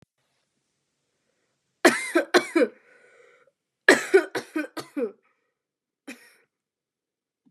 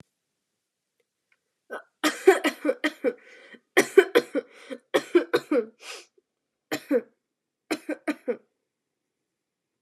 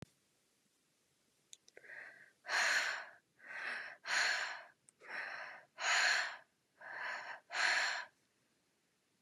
{"cough_length": "7.5 s", "cough_amplitude": 29647, "cough_signal_mean_std_ratio": 0.27, "three_cough_length": "9.8 s", "three_cough_amplitude": 23514, "three_cough_signal_mean_std_ratio": 0.3, "exhalation_length": "9.2 s", "exhalation_amplitude": 3445, "exhalation_signal_mean_std_ratio": 0.49, "survey_phase": "beta (2021-08-13 to 2022-03-07)", "age": "18-44", "gender": "Female", "wearing_mask": "No", "symptom_cough_any": true, "symptom_runny_or_blocked_nose": true, "symptom_fever_high_temperature": true, "symptom_onset": "13 days", "smoker_status": "Never smoked", "respiratory_condition_asthma": false, "respiratory_condition_other": false, "recruitment_source": "REACT", "submission_delay": "3 days", "covid_test_result": "Positive", "covid_test_method": "RT-qPCR", "covid_ct_value": 29.3, "covid_ct_gene": "E gene", "influenza_a_test_result": "Negative", "influenza_b_test_result": "Negative"}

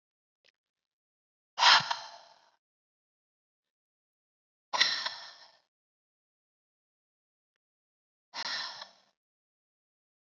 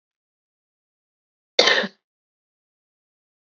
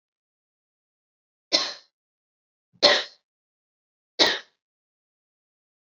{"exhalation_length": "10.3 s", "exhalation_amplitude": 14249, "exhalation_signal_mean_std_ratio": 0.21, "cough_length": "3.4 s", "cough_amplitude": 32767, "cough_signal_mean_std_ratio": 0.2, "three_cough_length": "5.8 s", "three_cough_amplitude": 28718, "three_cough_signal_mean_std_ratio": 0.22, "survey_phase": "beta (2021-08-13 to 2022-03-07)", "age": "18-44", "gender": "Female", "wearing_mask": "No", "symptom_none": true, "smoker_status": "Never smoked", "respiratory_condition_asthma": true, "respiratory_condition_other": false, "recruitment_source": "Test and Trace", "submission_delay": "1 day", "covid_test_result": "Negative", "covid_test_method": "LFT"}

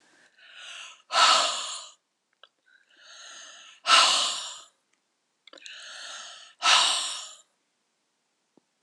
{"exhalation_length": "8.8 s", "exhalation_amplitude": 20550, "exhalation_signal_mean_std_ratio": 0.37, "survey_phase": "beta (2021-08-13 to 2022-03-07)", "age": "45-64", "gender": "Female", "wearing_mask": "No", "symptom_cough_any": true, "symptom_shortness_of_breath": true, "symptom_fatigue": true, "symptom_headache": true, "symptom_onset": "3 days", "smoker_status": "Never smoked", "respiratory_condition_asthma": true, "respiratory_condition_other": false, "recruitment_source": "Test and Trace", "submission_delay": "2 days", "covid_test_result": "Positive", "covid_test_method": "RT-qPCR", "covid_ct_value": 14.6, "covid_ct_gene": "ORF1ab gene", "covid_ct_mean": 14.9, "covid_viral_load": "13000000 copies/ml", "covid_viral_load_category": "High viral load (>1M copies/ml)"}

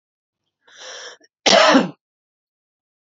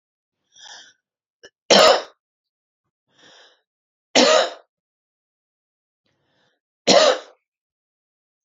{"cough_length": "3.1 s", "cough_amplitude": 32072, "cough_signal_mean_std_ratio": 0.31, "three_cough_length": "8.4 s", "three_cough_amplitude": 32767, "three_cough_signal_mean_std_ratio": 0.27, "survey_phase": "beta (2021-08-13 to 2022-03-07)", "age": "45-64", "gender": "Female", "wearing_mask": "No", "symptom_none": true, "smoker_status": "Ex-smoker", "respiratory_condition_asthma": false, "respiratory_condition_other": false, "recruitment_source": "REACT", "submission_delay": "1 day", "covid_test_result": "Negative", "covid_test_method": "RT-qPCR"}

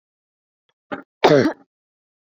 {"cough_length": "2.4 s", "cough_amplitude": 29676, "cough_signal_mean_std_ratio": 0.27, "survey_phase": "beta (2021-08-13 to 2022-03-07)", "age": "18-44", "gender": "Female", "wearing_mask": "No", "symptom_none": true, "smoker_status": "Never smoked", "respiratory_condition_asthma": false, "respiratory_condition_other": false, "recruitment_source": "REACT", "submission_delay": "2 days", "covid_test_result": "Negative", "covid_test_method": "RT-qPCR"}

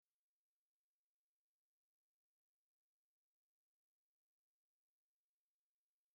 {"exhalation_length": "6.1 s", "exhalation_amplitude": 2, "exhalation_signal_mean_std_ratio": 0.11, "survey_phase": "beta (2021-08-13 to 2022-03-07)", "age": "45-64", "gender": "Male", "wearing_mask": "No", "symptom_runny_or_blocked_nose": true, "symptom_fatigue": true, "symptom_onset": "13 days", "smoker_status": "Never smoked", "respiratory_condition_asthma": false, "respiratory_condition_other": false, "recruitment_source": "REACT", "submission_delay": "1 day", "covid_test_result": "Negative", "covid_test_method": "RT-qPCR"}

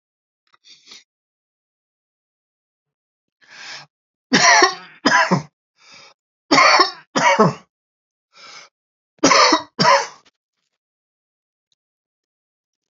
{"three_cough_length": "13.0 s", "three_cough_amplitude": 32767, "three_cough_signal_mean_std_ratio": 0.33, "survey_phase": "beta (2021-08-13 to 2022-03-07)", "age": "65+", "gender": "Male", "wearing_mask": "No", "symptom_none": true, "smoker_status": "Ex-smoker", "respiratory_condition_asthma": false, "respiratory_condition_other": false, "recruitment_source": "REACT", "submission_delay": "4 days", "covid_test_result": "Negative", "covid_test_method": "RT-qPCR", "influenza_a_test_result": "Negative", "influenza_b_test_result": "Negative"}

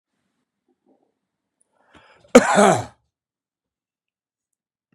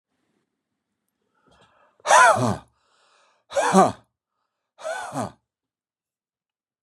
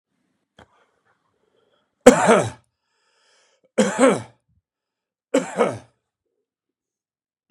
{"cough_length": "4.9 s", "cough_amplitude": 32768, "cough_signal_mean_std_ratio": 0.21, "exhalation_length": "6.8 s", "exhalation_amplitude": 28881, "exhalation_signal_mean_std_ratio": 0.29, "three_cough_length": "7.5 s", "three_cough_amplitude": 32768, "three_cough_signal_mean_std_ratio": 0.26, "survey_phase": "beta (2021-08-13 to 2022-03-07)", "age": "65+", "gender": "Male", "wearing_mask": "No", "symptom_none": true, "smoker_status": "Never smoked", "respiratory_condition_asthma": false, "respiratory_condition_other": false, "recruitment_source": "REACT", "submission_delay": "2 days", "covid_test_result": "Negative", "covid_test_method": "RT-qPCR", "influenza_a_test_result": "Negative", "influenza_b_test_result": "Negative"}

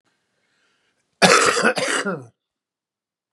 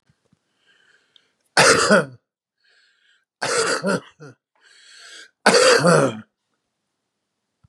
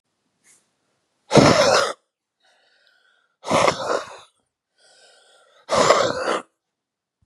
{"cough_length": "3.3 s", "cough_amplitude": 32767, "cough_signal_mean_std_ratio": 0.39, "three_cough_length": "7.7 s", "three_cough_amplitude": 32767, "three_cough_signal_mean_std_ratio": 0.37, "exhalation_length": "7.3 s", "exhalation_amplitude": 32186, "exhalation_signal_mean_std_ratio": 0.37, "survey_phase": "beta (2021-08-13 to 2022-03-07)", "age": "65+", "gender": "Male", "wearing_mask": "No", "symptom_cough_any": true, "symptom_onset": "7 days", "smoker_status": "Never smoked", "respiratory_condition_asthma": false, "respiratory_condition_other": false, "recruitment_source": "Test and Trace", "submission_delay": "2 days", "covid_test_result": "Positive", "covid_test_method": "ePCR"}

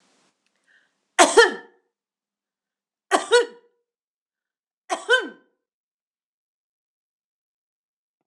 {"three_cough_length": "8.3 s", "three_cough_amplitude": 26028, "three_cough_signal_mean_std_ratio": 0.22, "survey_phase": "beta (2021-08-13 to 2022-03-07)", "age": "45-64", "gender": "Female", "wearing_mask": "No", "symptom_runny_or_blocked_nose": true, "symptom_onset": "3 days", "smoker_status": "Never smoked", "respiratory_condition_asthma": false, "respiratory_condition_other": false, "recruitment_source": "Test and Trace", "submission_delay": "2 days", "covid_test_result": "Positive", "covid_test_method": "ePCR"}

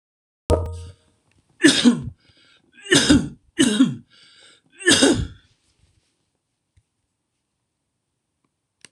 {"three_cough_length": "8.9 s", "three_cough_amplitude": 26018, "three_cough_signal_mean_std_ratio": 0.34, "survey_phase": "alpha (2021-03-01 to 2021-08-12)", "age": "65+", "gender": "Male", "wearing_mask": "No", "symptom_none": true, "smoker_status": "Ex-smoker", "respiratory_condition_asthma": false, "respiratory_condition_other": false, "recruitment_source": "REACT", "submission_delay": "1 day", "covid_test_result": "Negative", "covid_test_method": "RT-qPCR"}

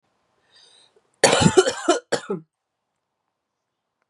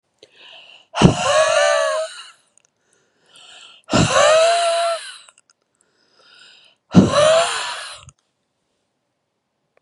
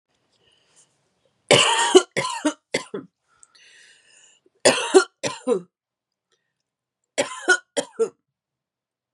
{"cough_length": "4.1 s", "cough_amplitude": 31507, "cough_signal_mean_std_ratio": 0.31, "exhalation_length": "9.8 s", "exhalation_amplitude": 32768, "exhalation_signal_mean_std_ratio": 0.46, "three_cough_length": "9.1 s", "three_cough_amplitude": 32583, "three_cough_signal_mean_std_ratio": 0.31, "survey_phase": "beta (2021-08-13 to 2022-03-07)", "age": "18-44", "gender": "Female", "wearing_mask": "No", "symptom_cough_any": true, "symptom_sore_throat": true, "smoker_status": "Never smoked", "respiratory_condition_asthma": false, "respiratory_condition_other": false, "recruitment_source": "Test and Trace", "submission_delay": "1 day", "covid_test_result": "Positive", "covid_test_method": "RT-qPCR", "covid_ct_value": 17.7, "covid_ct_gene": "ORF1ab gene"}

